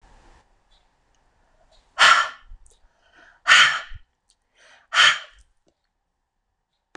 {"exhalation_length": "7.0 s", "exhalation_amplitude": 26024, "exhalation_signal_mean_std_ratio": 0.28, "survey_phase": "beta (2021-08-13 to 2022-03-07)", "age": "65+", "gender": "Female", "wearing_mask": "No", "symptom_none": true, "symptom_onset": "4 days", "smoker_status": "Never smoked", "respiratory_condition_asthma": false, "respiratory_condition_other": false, "recruitment_source": "REACT", "submission_delay": "2 days", "covid_test_result": "Negative", "covid_test_method": "RT-qPCR"}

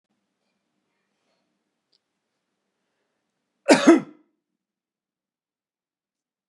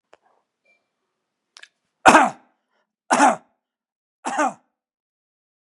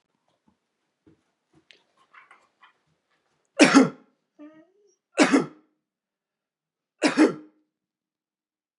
{"cough_length": "6.5 s", "cough_amplitude": 31307, "cough_signal_mean_std_ratio": 0.16, "exhalation_length": "5.6 s", "exhalation_amplitude": 32768, "exhalation_signal_mean_std_ratio": 0.25, "three_cough_length": "8.8 s", "three_cough_amplitude": 29672, "three_cough_signal_mean_std_ratio": 0.23, "survey_phase": "beta (2021-08-13 to 2022-03-07)", "age": "45-64", "gender": "Male", "wearing_mask": "No", "symptom_cough_any": true, "symptom_onset": "12 days", "smoker_status": "Never smoked", "respiratory_condition_asthma": false, "respiratory_condition_other": false, "recruitment_source": "REACT", "submission_delay": "2 days", "covid_test_result": "Negative", "covid_test_method": "RT-qPCR", "influenza_a_test_result": "Negative", "influenza_b_test_result": "Negative"}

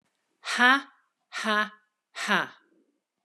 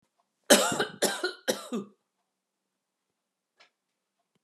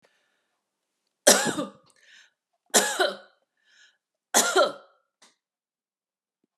{"exhalation_length": "3.2 s", "exhalation_amplitude": 16209, "exhalation_signal_mean_std_ratio": 0.37, "cough_length": "4.4 s", "cough_amplitude": 24807, "cough_signal_mean_std_ratio": 0.29, "three_cough_length": "6.6 s", "three_cough_amplitude": 29437, "three_cough_signal_mean_std_ratio": 0.29, "survey_phase": "beta (2021-08-13 to 2022-03-07)", "age": "45-64", "gender": "Female", "wearing_mask": "No", "symptom_none": true, "smoker_status": "Never smoked", "respiratory_condition_asthma": false, "respiratory_condition_other": false, "recruitment_source": "REACT", "submission_delay": "0 days", "covid_test_result": "Negative", "covid_test_method": "RT-qPCR"}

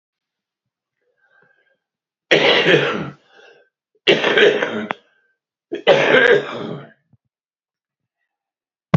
{"three_cough_length": "9.0 s", "three_cough_amplitude": 32767, "three_cough_signal_mean_std_ratio": 0.39, "survey_phase": "beta (2021-08-13 to 2022-03-07)", "age": "45-64", "gender": "Male", "wearing_mask": "No", "symptom_cough_any": true, "symptom_fatigue": true, "smoker_status": "Current smoker (11 or more cigarettes per day)", "respiratory_condition_asthma": false, "respiratory_condition_other": true, "recruitment_source": "Test and Trace", "submission_delay": "1 day", "covid_test_result": "Positive", "covid_test_method": "RT-qPCR"}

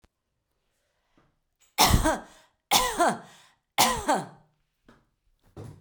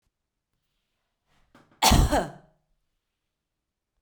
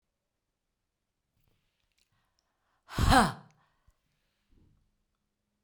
{"three_cough_length": "5.8 s", "three_cough_amplitude": 24443, "three_cough_signal_mean_std_ratio": 0.36, "cough_length": "4.0 s", "cough_amplitude": 18406, "cough_signal_mean_std_ratio": 0.25, "exhalation_length": "5.6 s", "exhalation_amplitude": 11748, "exhalation_signal_mean_std_ratio": 0.2, "survey_phase": "beta (2021-08-13 to 2022-03-07)", "age": "65+", "gender": "Female", "wearing_mask": "No", "symptom_none": true, "smoker_status": "Ex-smoker", "respiratory_condition_asthma": false, "respiratory_condition_other": false, "recruitment_source": "REACT", "submission_delay": "2 days", "covid_test_result": "Negative", "covid_test_method": "RT-qPCR"}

